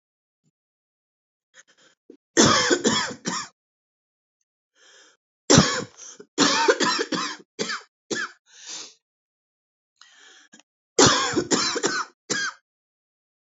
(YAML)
three_cough_length: 13.5 s
three_cough_amplitude: 26204
three_cough_signal_mean_std_ratio: 0.38
survey_phase: beta (2021-08-13 to 2022-03-07)
age: 18-44
gender: Female
wearing_mask: 'No'
symptom_cough_any: true
symptom_new_continuous_cough: true
symptom_runny_or_blocked_nose: true
symptom_sore_throat: true
symptom_abdominal_pain: true
symptom_fatigue: true
symptom_headache: true
symptom_change_to_sense_of_smell_or_taste: true
symptom_other: true
smoker_status: Current smoker (11 or more cigarettes per day)
respiratory_condition_asthma: false
respiratory_condition_other: false
recruitment_source: Test and Trace
submission_delay: 2 days
covid_test_result: Positive
covid_test_method: RT-qPCR
covid_ct_value: 18.9
covid_ct_gene: N gene
covid_ct_mean: 19.2
covid_viral_load: 510000 copies/ml
covid_viral_load_category: Low viral load (10K-1M copies/ml)